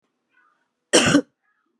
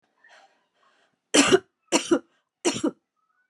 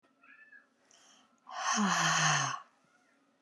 cough_length: 1.8 s
cough_amplitude: 27739
cough_signal_mean_std_ratio: 0.31
three_cough_length: 3.5 s
three_cough_amplitude: 27650
three_cough_signal_mean_std_ratio: 0.32
exhalation_length: 3.4 s
exhalation_amplitude: 5681
exhalation_signal_mean_std_ratio: 0.49
survey_phase: beta (2021-08-13 to 2022-03-07)
age: 45-64
gender: Female
wearing_mask: 'No'
symptom_cough_any: true
symptom_new_continuous_cough: true
symptom_runny_or_blocked_nose: true
symptom_sore_throat: true
symptom_abdominal_pain: true
symptom_fatigue: true
symptom_headache: true
symptom_onset: 2 days
smoker_status: Never smoked
respiratory_condition_asthma: false
respiratory_condition_other: false
recruitment_source: Test and Trace
submission_delay: 1 day
covid_test_result: Positive
covid_test_method: RT-qPCR
covid_ct_value: 26.7
covid_ct_gene: N gene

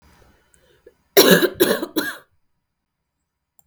three_cough_length: 3.7 s
three_cough_amplitude: 32768
three_cough_signal_mean_std_ratio: 0.32
survey_phase: beta (2021-08-13 to 2022-03-07)
age: 18-44
gender: Female
wearing_mask: 'No'
symptom_cough_any: true
symptom_new_continuous_cough: true
symptom_fatigue: true
symptom_fever_high_temperature: true
symptom_headache: true
symptom_change_to_sense_of_smell_or_taste: true
symptom_onset: 9 days
smoker_status: Never smoked
respiratory_condition_asthma: false
respiratory_condition_other: false
recruitment_source: Test and Trace
submission_delay: 1 day
covid_test_result: Positive
covid_test_method: RT-qPCR
covid_ct_value: 11.4
covid_ct_gene: ORF1ab gene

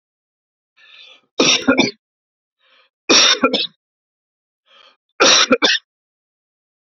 three_cough_length: 7.0 s
three_cough_amplitude: 32767
three_cough_signal_mean_std_ratio: 0.36
survey_phase: beta (2021-08-13 to 2022-03-07)
age: 45-64
gender: Male
wearing_mask: 'No'
symptom_cough_any: true
symptom_runny_or_blocked_nose: true
symptom_sore_throat: true
symptom_fatigue: true
symptom_fever_high_temperature: true
symptom_headache: true
symptom_onset: 5 days
smoker_status: Ex-smoker
respiratory_condition_asthma: true
respiratory_condition_other: false
recruitment_source: Test and Trace
submission_delay: 2 days
covid_test_result: Negative
covid_test_method: RT-qPCR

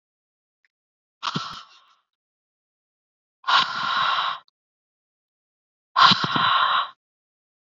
exhalation_length: 7.8 s
exhalation_amplitude: 25596
exhalation_signal_mean_std_ratio: 0.38
survey_phase: beta (2021-08-13 to 2022-03-07)
age: 18-44
gender: Female
wearing_mask: 'No'
symptom_cough_any: true
symptom_runny_or_blocked_nose: true
symptom_fatigue: true
symptom_headache: true
symptom_other: true
symptom_onset: 7 days
smoker_status: Never smoked
respiratory_condition_asthma: true
respiratory_condition_other: false
recruitment_source: Test and Trace
submission_delay: 2 days
covid_test_result: Positive
covid_test_method: RT-qPCR
covid_ct_value: 27.3
covid_ct_gene: N gene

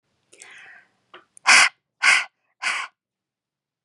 exhalation_length: 3.8 s
exhalation_amplitude: 28406
exhalation_signal_mean_std_ratio: 0.3
survey_phase: beta (2021-08-13 to 2022-03-07)
age: 45-64
gender: Female
wearing_mask: 'No'
symptom_none: true
smoker_status: Never smoked
respiratory_condition_asthma: false
respiratory_condition_other: false
recruitment_source: REACT
submission_delay: 1 day
covid_test_result: Negative
covid_test_method: RT-qPCR
influenza_a_test_result: Negative
influenza_b_test_result: Negative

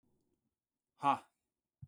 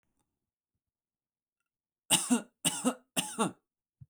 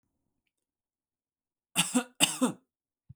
exhalation_length: 1.9 s
exhalation_amplitude: 3961
exhalation_signal_mean_std_ratio: 0.21
three_cough_length: 4.1 s
three_cough_amplitude: 9577
three_cough_signal_mean_std_ratio: 0.32
cough_length: 3.2 s
cough_amplitude: 15206
cough_signal_mean_std_ratio: 0.28
survey_phase: alpha (2021-03-01 to 2021-08-12)
age: 18-44
gender: Male
wearing_mask: 'No'
symptom_none: true
smoker_status: Ex-smoker
respiratory_condition_asthma: false
respiratory_condition_other: false
recruitment_source: REACT
submission_delay: 1 day
covid_test_result: Negative
covid_test_method: RT-qPCR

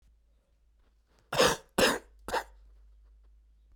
cough_length: 3.8 s
cough_amplitude: 10464
cough_signal_mean_std_ratio: 0.32
survey_phase: beta (2021-08-13 to 2022-03-07)
age: 45-64
gender: Male
wearing_mask: 'No'
symptom_cough_any: true
symptom_runny_or_blocked_nose: true
symptom_sore_throat: true
symptom_fever_high_temperature: true
symptom_headache: true
symptom_onset: 4 days
smoker_status: Never smoked
respiratory_condition_asthma: false
respiratory_condition_other: false
recruitment_source: Test and Trace
submission_delay: 2 days
covid_test_result: Positive
covid_test_method: RT-qPCR
covid_ct_value: 19.3
covid_ct_gene: ORF1ab gene
covid_ct_mean: 19.5
covid_viral_load: 400000 copies/ml
covid_viral_load_category: Low viral load (10K-1M copies/ml)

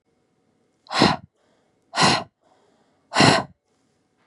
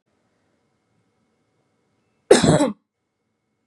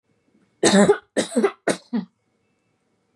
exhalation_length: 4.3 s
exhalation_amplitude: 29571
exhalation_signal_mean_std_ratio: 0.33
cough_length: 3.7 s
cough_amplitude: 32768
cough_signal_mean_std_ratio: 0.24
three_cough_length: 3.2 s
three_cough_amplitude: 25539
three_cough_signal_mean_std_ratio: 0.38
survey_phase: beta (2021-08-13 to 2022-03-07)
age: 18-44
gender: Female
wearing_mask: 'No'
symptom_none: true
smoker_status: Never smoked
respiratory_condition_asthma: false
respiratory_condition_other: false
recruitment_source: REACT
submission_delay: 0 days
covid_test_result: Negative
covid_test_method: RT-qPCR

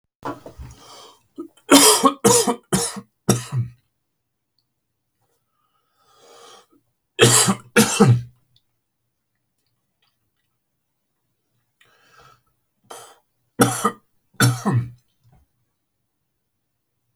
three_cough_length: 17.2 s
three_cough_amplitude: 32767
three_cough_signal_mean_std_ratio: 0.3
survey_phase: alpha (2021-03-01 to 2021-08-12)
age: 45-64
gender: Male
wearing_mask: 'No'
symptom_none: true
smoker_status: Never smoked
respiratory_condition_asthma: false
respiratory_condition_other: false
recruitment_source: REACT
submission_delay: 1 day
covid_test_result: Negative
covid_test_method: RT-qPCR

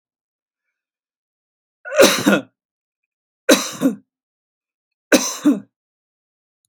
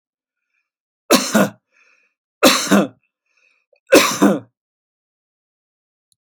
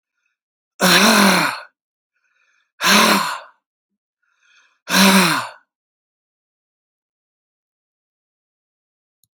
three_cough_length: 6.7 s
three_cough_amplitude: 32663
three_cough_signal_mean_std_ratio: 0.3
cough_length: 6.2 s
cough_amplitude: 32767
cough_signal_mean_std_ratio: 0.32
exhalation_length: 9.4 s
exhalation_amplitude: 32767
exhalation_signal_mean_std_ratio: 0.36
survey_phase: alpha (2021-03-01 to 2021-08-12)
age: 65+
gender: Male
wearing_mask: 'No'
symptom_none: true
smoker_status: Never smoked
respiratory_condition_asthma: false
respiratory_condition_other: false
recruitment_source: REACT
submission_delay: 1 day
covid_test_result: Negative
covid_test_method: RT-qPCR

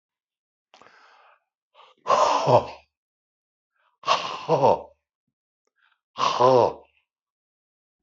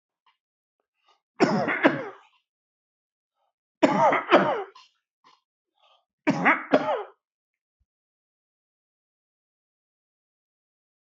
exhalation_length: 8.0 s
exhalation_amplitude: 19515
exhalation_signal_mean_std_ratio: 0.35
three_cough_length: 11.0 s
three_cough_amplitude: 22176
three_cough_signal_mean_std_ratio: 0.31
survey_phase: beta (2021-08-13 to 2022-03-07)
age: 65+
gender: Male
wearing_mask: 'No'
symptom_none: true
smoker_status: Ex-smoker
respiratory_condition_asthma: false
respiratory_condition_other: false
recruitment_source: REACT
submission_delay: 3 days
covid_test_result: Negative
covid_test_method: RT-qPCR
influenza_a_test_result: Negative
influenza_b_test_result: Negative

